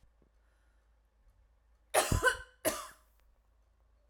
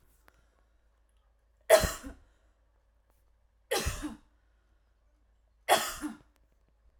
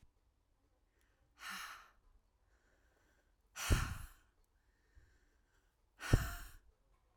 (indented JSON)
{
  "cough_length": "4.1 s",
  "cough_amplitude": 7552,
  "cough_signal_mean_std_ratio": 0.29,
  "three_cough_length": "7.0 s",
  "three_cough_amplitude": 14725,
  "three_cough_signal_mean_std_ratio": 0.25,
  "exhalation_length": "7.2 s",
  "exhalation_amplitude": 6150,
  "exhalation_signal_mean_std_ratio": 0.25,
  "survey_phase": "alpha (2021-03-01 to 2021-08-12)",
  "age": "18-44",
  "gender": "Female",
  "wearing_mask": "No",
  "symptom_none": true,
  "smoker_status": "Never smoked",
  "respiratory_condition_asthma": false,
  "respiratory_condition_other": false,
  "recruitment_source": "REACT",
  "submission_delay": "1 day",
  "covid_test_result": "Negative",
  "covid_test_method": "RT-qPCR"
}